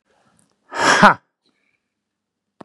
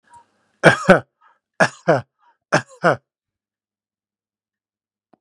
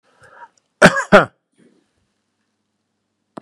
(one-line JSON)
{"exhalation_length": "2.6 s", "exhalation_amplitude": 32768, "exhalation_signal_mean_std_ratio": 0.27, "three_cough_length": "5.2 s", "three_cough_amplitude": 32768, "three_cough_signal_mean_std_ratio": 0.25, "cough_length": "3.4 s", "cough_amplitude": 32768, "cough_signal_mean_std_ratio": 0.22, "survey_phase": "beta (2021-08-13 to 2022-03-07)", "age": "65+", "gender": "Male", "wearing_mask": "No", "symptom_none": true, "smoker_status": "Ex-smoker", "respiratory_condition_asthma": false, "respiratory_condition_other": false, "recruitment_source": "REACT", "submission_delay": "0 days", "covid_test_result": "Negative", "covid_test_method": "RT-qPCR", "influenza_a_test_result": "Negative", "influenza_b_test_result": "Negative"}